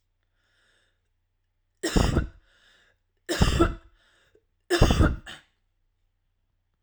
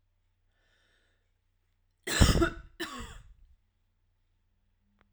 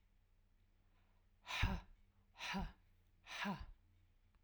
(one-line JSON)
{"three_cough_length": "6.8 s", "three_cough_amplitude": 20197, "three_cough_signal_mean_std_ratio": 0.33, "cough_length": "5.1 s", "cough_amplitude": 15573, "cough_signal_mean_std_ratio": 0.24, "exhalation_length": "4.4 s", "exhalation_amplitude": 2036, "exhalation_signal_mean_std_ratio": 0.4, "survey_phase": "alpha (2021-03-01 to 2021-08-12)", "age": "45-64", "gender": "Female", "wearing_mask": "No", "symptom_none": true, "smoker_status": "Never smoked", "respiratory_condition_asthma": false, "respiratory_condition_other": false, "recruitment_source": "REACT", "submission_delay": "2 days", "covid_test_result": "Negative", "covid_test_method": "RT-qPCR"}